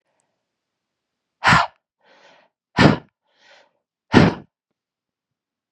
{"exhalation_length": "5.7 s", "exhalation_amplitude": 32768, "exhalation_signal_mean_std_ratio": 0.25, "survey_phase": "beta (2021-08-13 to 2022-03-07)", "age": "45-64", "gender": "Female", "wearing_mask": "No", "symptom_cough_any": true, "symptom_runny_or_blocked_nose": true, "symptom_fatigue": true, "symptom_headache": true, "symptom_onset": "3 days", "smoker_status": "Never smoked", "respiratory_condition_asthma": false, "respiratory_condition_other": false, "recruitment_source": "Test and Trace", "submission_delay": "2 days", "covid_test_result": "Positive", "covid_test_method": "RT-qPCR", "covid_ct_value": 19.1, "covid_ct_gene": "ORF1ab gene", "covid_ct_mean": 19.7, "covid_viral_load": "330000 copies/ml", "covid_viral_load_category": "Low viral load (10K-1M copies/ml)"}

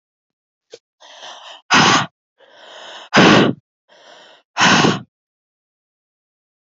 {"exhalation_length": "6.7 s", "exhalation_amplitude": 31231, "exhalation_signal_mean_std_ratio": 0.35, "survey_phase": "beta (2021-08-13 to 2022-03-07)", "age": "45-64", "gender": "Female", "wearing_mask": "No", "symptom_cough_any": true, "symptom_runny_or_blocked_nose": true, "symptom_shortness_of_breath": true, "symptom_fatigue": true, "symptom_headache": true, "symptom_change_to_sense_of_smell_or_taste": true, "symptom_loss_of_taste": true, "symptom_onset": "4 days", "smoker_status": "Current smoker (11 or more cigarettes per day)", "respiratory_condition_asthma": false, "respiratory_condition_other": false, "recruitment_source": "Test and Trace", "submission_delay": "2 days", "covid_test_result": "Positive", "covid_test_method": "RT-qPCR", "covid_ct_value": 14.0, "covid_ct_gene": "ORF1ab gene", "covid_ct_mean": 14.4, "covid_viral_load": "19000000 copies/ml", "covid_viral_load_category": "High viral load (>1M copies/ml)"}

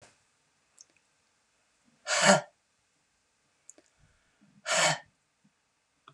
{"exhalation_length": "6.1 s", "exhalation_amplitude": 18331, "exhalation_signal_mean_std_ratio": 0.25, "survey_phase": "beta (2021-08-13 to 2022-03-07)", "age": "65+", "gender": "Female", "wearing_mask": "No", "symptom_none": true, "smoker_status": "Never smoked", "respiratory_condition_asthma": false, "respiratory_condition_other": false, "recruitment_source": "REACT", "submission_delay": "3 days", "covid_test_result": "Negative", "covid_test_method": "RT-qPCR", "influenza_a_test_result": "Negative", "influenza_b_test_result": "Negative"}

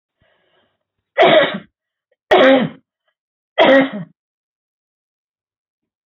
{"three_cough_length": "6.1 s", "three_cough_amplitude": 28641, "three_cough_signal_mean_std_ratio": 0.35, "survey_phase": "beta (2021-08-13 to 2022-03-07)", "age": "45-64", "gender": "Female", "wearing_mask": "No", "symptom_cough_any": true, "smoker_status": "Never smoked", "respiratory_condition_asthma": false, "respiratory_condition_other": false, "recruitment_source": "Test and Trace", "submission_delay": "0 days", "covid_test_result": "Negative", "covid_test_method": "LFT"}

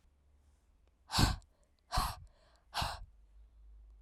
{"exhalation_length": "4.0 s", "exhalation_amplitude": 6049, "exhalation_signal_mean_std_ratio": 0.35, "survey_phase": "alpha (2021-03-01 to 2021-08-12)", "age": "18-44", "gender": "Female", "wearing_mask": "No", "symptom_cough_any": true, "symptom_new_continuous_cough": true, "symptom_shortness_of_breath": true, "symptom_fatigue": true, "symptom_headache": true, "symptom_change_to_sense_of_smell_or_taste": true, "symptom_loss_of_taste": true, "symptom_onset": "6 days", "smoker_status": "Never smoked", "respiratory_condition_asthma": false, "respiratory_condition_other": false, "recruitment_source": "Test and Trace", "submission_delay": "2 days", "covid_test_result": "Positive", "covid_test_method": "RT-qPCR", "covid_ct_value": 16.2, "covid_ct_gene": "ORF1ab gene", "covid_ct_mean": 17.3, "covid_viral_load": "2100000 copies/ml", "covid_viral_load_category": "High viral load (>1M copies/ml)"}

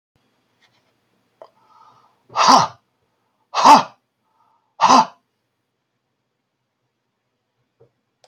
{"exhalation_length": "8.3 s", "exhalation_amplitude": 30952, "exhalation_signal_mean_std_ratio": 0.25, "survey_phase": "beta (2021-08-13 to 2022-03-07)", "age": "65+", "gender": "Male", "wearing_mask": "No", "symptom_shortness_of_breath": true, "symptom_fatigue": true, "smoker_status": "Ex-smoker", "respiratory_condition_asthma": true, "respiratory_condition_other": false, "recruitment_source": "REACT", "submission_delay": "3 days", "covid_test_result": "Negative", "covid_test_method": "RT-qPCR"}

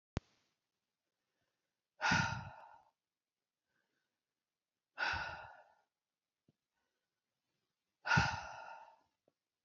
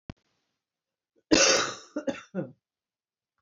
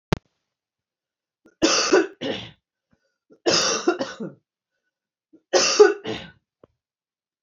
{"exhalation_length": "9.6 s", "exhalation_amplitude": 3726, "exhalation_signal_mean_std_ratio": 0.28, "cough_length": "3.4 s", "cough_amplitude": 15837, "cough_signal_mean_std_ratio": 0.32, "three_cough_length": "7.4 s", "three_cough_amplitude": 27557, "three_cough_signal_mean_std_ratio": 0.35, "survey_phase": "beta (2021-08-13 to 2022-03-07)", "age": "45-64", "gender": "Female", "wearing_mask": "No", "symptom_cough_any": true, "symptom_sore_throat": true, "smoker_status": "Ex-smoker", "respiratory_condition_asthma": false, "respiratory_condition_other": false, "recruitment_source": "REACT", "submission_delay": "3 days", "covid_test_result": "Negative", "covid_test_method": "RT-qPCR", "influenza_a_test_result": "Negative", "influenza_b_test_result": "Negative"}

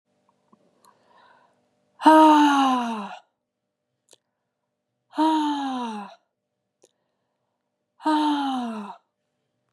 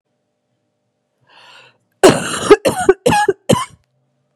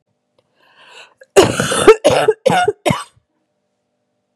{"exhalation_length": "9.7 s", "exhalation_amplitude": 28167, "exhalation_signal_mean_std_ratio": 0.38, "three_cough_length": "4.4 s", "three_cough_amplitude": 32768, "three_cough_signal_mean_std_ratio": 0.36, "cough_length": "4.4 s", "cough_amplitude": 32768, "cough_signal_mean_std_ratio": 0.39, "survey_phase": "beta (2021-08-13 to 2022-03-07)", "age": "18-44", "gender": "Female", "wearing_mask": "No", "symptom_cough_any": true, "symptom_new_continuous_cough": true, "symptom_runny_or_blocked_nose": true, "symptom_shortness_of_breath": true, "symptom_sore_throat": true, "symptom_fatigue": true, "symptom_fever_high_temperature": true, "symptom_headache": true, "symptom_change_to_sense_of_smell_or_taste": true, "symptom_loss_of_taste": true, "symptom_other": true, "symptom_onset": "3 days", "smoker_status": "Never smoked", "respiratory_condition_asthma": false, "respiratory_condition_other": false, "recruitment_source": "Test and Trace", "submission_delay": "2 days", "covid_test_result": "Positive", "covid_test_method": "RT-qPCR", "covid_ct_value": 19.6, "covid_ct_gene": "N gene"}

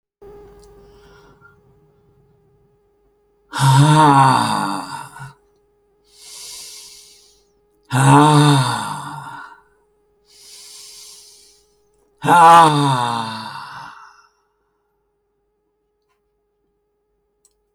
{"exhalation_length": "17.7 s", "exhalation_amplitude": 30414, "exhalation_signal_mean_std_ratio": 0.37, "survey_phase": "alpha (2021-03-01 to 2021-08-12)", "age": "65+", "gender": "Male", "wearing_mask": "No", "symptom_none": true, "smoker_status": "Never smoked", "respiratory_condition_asthma": false, "respiratory_condition_other": false, "recruitment_source": "REACT", "submission_delay": "4 days", "covid_test_result": "Negative", "covid_test_method": "RT-qPCR"}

